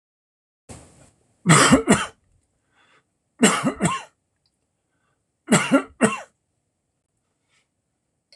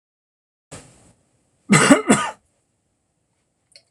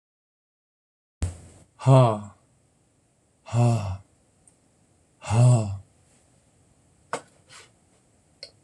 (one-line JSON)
{"three_cough_length": "8.4 s", "three_cough_amplitude": 26027, "three_cough_signal_mean_std_ratio": 0.31, "cough_length": "3.9 s", "cough_amplitude": 26028, "cough_signal_mean_std_ratio": 0.28, "exhalation_length": "8.6 s", "exhalation_amplitude": 20325, "exhalation_signal_mean_std_ratio": 0.32, "survey_phase": "alpha (2021-03-01 to 2021-08-12)", "age": "65+", "gender": "Male", "wearing_mask": "No", "symptom_none": true, "smoker_status": "Never smoked", "respiratory_condition_asthma": false, "respiratory_condition_other": false, "recruitment_source": "REACT", "submission_delay": "2 days", "covid_test_result": "Negative", "covid_test_method": "RT-qPCR"}